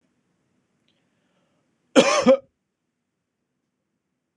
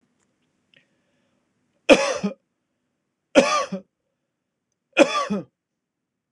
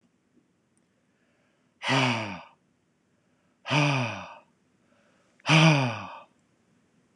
{"cough_length": "4.4 s", "cough_amplitude": 26028, "cough_signal_mean_std_ratio": 0.23, "three_cough_length": "6.3 s", "three_cough_amplitude": 26028, "three_cough_signal_mean_std_ratio": 0.27, "exhalation_length": "7.2 s", "exhalation_amplitude": 17443, "exhalation_signal_mean_std_ratio": 0.36, "survey_phase": "beta (2021-08-13 to 2022-03-07)", "age": "45-64", "gender": "Male", "wearing_mask": "No", "symptom_none": true, "smoker_status": "Ex-smoker", "respiratory_condition_asthma": false, "respiratory_condition_other": false, "recruitment_source": "REACT", "submission_delay": "3 days", "covid_test_result": "Negative", "covid_test_method": "RT-qPCR", "influenza_a_test_result": "Negative", "influenza_b_test_result": "Negative"}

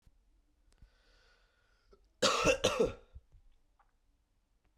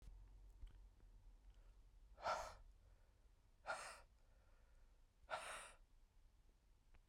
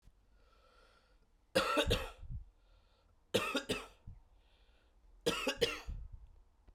{"cough_length": "4.8 s", "cough_amplitude": 6573, "cough_signal_mean_std_ratio": 0.3, "exhalation_length": "7.1 s", "exhalation_amplitude": 791, "exhalation_signal_mean_std_ratio": 0.51, "three_cough_length": "6.7 s", "three_cough_amplitude": 4448, "three_cough_signal_mean_std_ratio": 0.42, "survey_phase": "beta (2021-08-13 to 2022-03-07)", "age": "18-44", "gender": "Male", "wearing_mask": "No", "symptom_runny_or_blocked_nose": true, "symptom_onset": "5 days", "smoker_status": "Never smoked", "respiratory_condition_asthma": false, "respiratory_condition_other": false, "recruitment_source": "Test and Trace", "submission_delay": "1 day", "covid_test_result": "Positive", "covid_test_method": "RT-qPCR", "covid_ct_value": 18.3, "covid_ct_gene": "ORF1ab gene", "covid_ct_mean": 18.6, "covid_viral_load": "770000 copies/ml", "covid_viral_load_category": "Low viral load (10K-1M copies/ml)"}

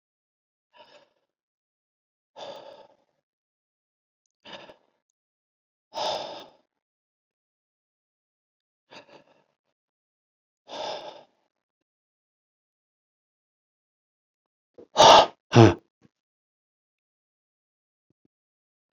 {"exhalation_length": "18.9 s", "exhalation_amplitude": 29924, "exhalation_signal_mean_std_ratio": 0.15, "survey_phase": "beta (2021-08-13 to 2022-03-07)", "age": "65+", "gender": "Male", "wearing_mask": "No", "symptom_none": true, "smoker_status": "Never smoked", "respiratory_condition_asthma": false, "respiratory_condition_other": false, "recruitment_source": "REACT", "submission_delay": "3 days", "covid_test_result": "Negative", "covid_test_method": "RT-qPCR"}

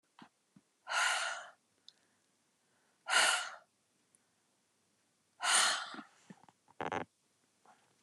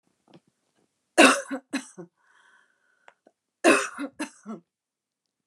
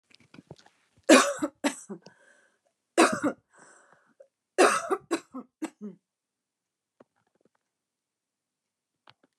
{"exhalation_length": "8.0 s", "exhalation_amplitude": 6143, "exhalation_signal_mean_std_ratio": 0.35, "cough_length": "5.5 s", "cough_amplitude": 24918, "cough_signal_mean_std_ratio": 0.26, "three_cough_length": "9.4 s", "three_cough_amplitude": 19334, "three_cough_signal_mean_std_ratio": 0.25, "survey_phase": "beta (2021-08-13 to 2022-03-07)", "age": "45-64", "gender": "Female", "wearing_mask": "No", "symptom_fatigue": true, "symptom_other": true, "symptom_onset": "9 days", "smoker_status": "Never smoked", "respiratory_condition_asthma": false, "respiratory_condition_other": false, "recruitment_source": "REACT", "submission_delay": "1 day", "covid_test_result": "Negative", "covid_test_method": "RT-qPCR"}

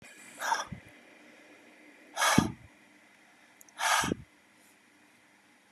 {"exhalation_length": "5.7 s", "exhalation_amplitude": 16343, "exhalation_signal_mean_std_ratio": 0.35, "survey_phase": "beta (2021-08-13 to 2022-03-07)", "age": "65+", "gender": "Male", "wearing_mask": "No", "symptom_none": true, "smoker_status": "Ex-smoker", "respiratory_condition_asthma": false, "respiratory_condition_other": false, "recruitment_source": "REACT", "submission_delay": "2 days", "covid_test_result": "Negative", "covid_test_method": "RT-qPCR", "influenza_a_test_result": "Negative", "influenza_b_test_result": "Negative"}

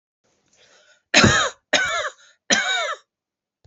{"three_cough_length": "3.7 s", "three_cough_amplitude": 30262, "three_cough_signal_mean_std_ratio": 0.43, "survey_phase": "beta (2021-08-13 to 2022-03-07)", "age": "45-64", "gender": "Female", "wearing_mask": "No", "symptom_runny_or_blocked_nose": true, "smoker_status": "Never smoked", "respiratory_condition_asthma": false, "respiratory_condition_other": false, "recruitment_source": "Test and Trace", "submission_delay": "2 days", "covid_test_result": "Positive", "covid_test_method": "LFT"}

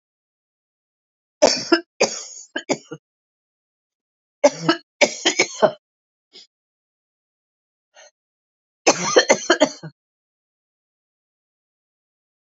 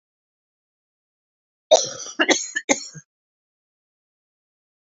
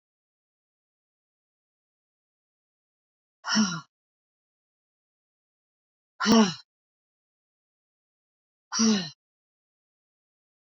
{"three_cough_length": "12.5 s", "three_cough_amplitude": 29976, "three_cough_signal_mean_std_ratio": 0.26, "cough_length": "4.9 s", "cough_amplitude": 29024, "cough_signal_mean_std_ratio": 0.24, "exhalation_length": "10.8 s", "exhalation_amplitude": 13504, "exhalation_signal_mean_std_ratio": 0.23, "survey_phase": "alpha (2021-03-01 to 2021-08-12)", "age": "65+", "gender": "Female", "wearing_mask": "No", "symptom_cough_any": true, "symptom_fatigue": true, "symptom_fever_high_temperature": true, "symptom_headache": true, "smoker_status": "Ex-smoker", "respiratory_condition_asthma": false, "respiratory_condition_other": false, "recruitment_source": "Test and Trace", "submission_delay": "2 days", "covid_test_result": "Positive", "covid_test_method": "RT-qPCR", "covid_ct_value": 14.2, "covid_ct_gene": "ORF1ab gene", "covid_ct_mean": 15.3, "covid_viral_load": "9700000 copies/ml", "covid_viral_load_category": "High viral load (>1M copies/ml)"}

